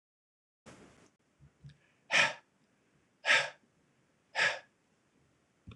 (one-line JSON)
{"exhalation_length": "5.8 s", "exhalation_amplitude": 7433, "exhalation_signal_mean_std_ratio": 0.27, "survey_phase": "alpha (2021-03-01 to 2021-08-12)", "age": "45-64", "gender": "Male", "wearing_mask": "No", "symptom_none": true, "smoker_status": "Never smoked", "respiratory_condition_asthma": false, "respiratory_condition_other": false, "recruitment_source": "REACT", "submission_delay": "2 days", "covid_test_result": "Negative", "covid_test_method": "RT-qPCR"}